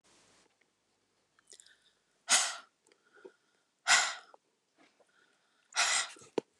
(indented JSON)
{
  "exhalation_length": "6.6 s",
  "exhalation_amplitude": 8861,
  "exhalation_signal_mean_std_ratio": 0.28,
  "survey_phase": "beta (2021-08-13 to 2022-03-07)",
  "age": "45-64",
  "gender": "Female",
  "wearing_mask": "No",
  "symptom_none": true,
  "smoker_status": "Ex-smoker",
  "respiratory_condition_asthma": false,
  "respiratory_condition_other": false,
  "recruitment_source": "Test and Trace",
  "submission_delay": "2 days",
  "covid_test_result": "Negative",
  "covid_test_method": "RT-qPCR"
}